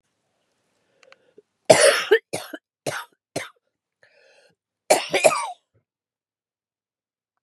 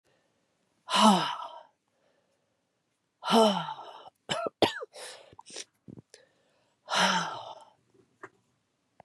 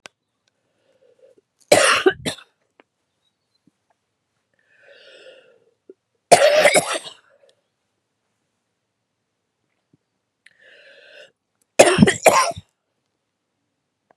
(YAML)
cough_length: 7.4 s
cough_amplitude: 32767
cough_signal_mean_std_ratio: 0.27
exhalation_length: 9.0 s
exhalation_amplitude: 13212
exhalation_signal_mean_std_ratio: 0.34
three_cough_length: 14.2 s
three_cough_amplitude: 32768
three_cough_signal_mean_std_ratio: 0.26
survey_phase: beta (2021-08-13 to 2022-03-07)
age: 45-64
gender: Female
wearing_mask: 'No'
symptom_cough_any: true
symptom_runny_or_blocked_nose: true
symptom_sore_throat: true
symptom_diarrhoea: true
symptom_fatigue: true
symptom_fever_high_temperature: true
symptom_headache: true
symptom_change_to_sense_of_smell_or_taste: true
symptom_onset: 3 days
smoker_status: Never smoked
respiratory_condition_asthma: false
respiratory_condition_other: false
recruitment_source: Test and Trace
submission_delay: 1 day
covid_test_result: Positive
covid_test_method: RT-qPCR
covid_ct_value: 25.9
covid_ct_gene: ORF1ab gene